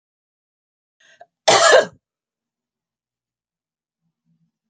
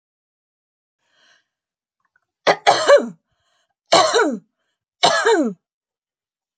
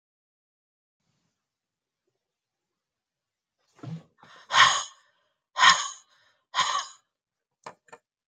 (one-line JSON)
{"cough_length": "4.7 s", "cough_amplitude": 29590, "cough_signal_mean_std_ratio": 0.23, "three_cough_length": "6.6 s", "three_cough_amplitude": 32767, "three_cough_signal_mean_std_ratio": 0.35, "exhalation_length": "8.3 s", "exhalation_amplitude": 23436, "exhalation_signal_mean_std_ratio": 0.24, "survey_phase": "beta (2021-08-13 to 2022-03-07)", "age": "65+", "gender": "Female", "wearing_mask": "No", "symptom_none": true, "smoker_status": "Never smoked", "respiratory_condition_asthma": false, "respiratory_condition_other": false, "recruitment_source": "REACT", "submission_delay": "1 day", "covid_test_result": "Negative", "covid_test_method": "RT-qPCR"}